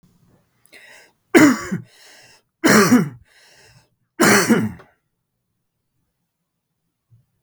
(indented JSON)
{
  "three_cough_length": "7.4 s",
  "three_cough_amplitude": 32768,
  "three_cough_signal_mean_std_ratio": 0.33,
  "survey_phase": "beta (2021-08-13 to 2022-03-07)",
  "age": "45-64",
  "gender": "Male",
  "wearing_mask": "No",
  "symptom_none": true,
  "smoker_status": "Ex-smoker",
  "respiratory_condition_asthma": false,
  "respiratory_condition_other": false,
  "recruitment_source": "REACT",
  "submission_delay": "2 days",
  "covid_test_result": "Negative",
  "covid_test_method": "RT-qPCR",
  "influenza_a_test_result": "Negative",
  "influenza_b_test_result": "Negative"
}